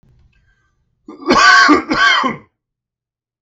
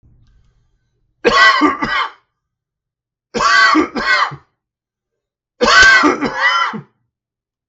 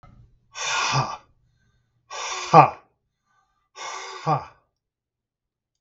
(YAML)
cough_length: 3.4 s
cough_amplitude: 32767
cough_signal_mean_std_ratio: 0.46
three_cough_length: 7.7 s
three_cough_amplitude: 32768
three_cough_signal_mean_std_ratio: 0.5
exhalation_length: 5.8 s
exhalation_amplitude: 32768
exhalation_signal_mean_std_ratio: 0.29
survey_phase: beta (2021-08-13 to 2022-03-07)
age: 65+
gender: Male
wearing_mask: 'Yes'
symptom_none: true
smoker_status: Ex-smoker
respiratory_condition_asthma: false
respiratory_condition_other: false
recruitment_source: Test and Trace
submission_delay: 13 days
covid_test_method: RT-qPCR